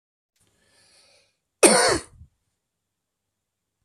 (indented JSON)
{
  "cough_length": "3.8 s",
  "cough_amplitude": 32767,
  "cough_signal_mean_std_ratio": 0.24,
  "survey_phase": "beta (2021-08-13 to 2022-03-07)",
  "age": "45-64",
  "gender": "Male",
  "wearing_mask": "No",
  "symptom_cough_any": true,
  "symptom_fatigue": true,
  "symptom_fever_high_temperature": true,
  "symptom_other": true,
  "symptom_onset": "7 days",
  "smoker_status": "Never smoked",
  "respiratory_condition_asthma": false,
  "respiratory_condition_other": false,
  "recruitment_source": "Test and Trace",
  "submission_delay": "2 days",
  "covid_test_result": "Positive",
  "covid_test_method": "RT-qPCR",
  "covid_ct_value": 12.8,
  "covid_ct_gene": "ORF1ab gene",
  "covid_ct_mean": 13.4,
  "covid_viral_load": "41000000 copies/ml",
  "covid_viral_load_category": "High viral load (>1M copies/ml)"
}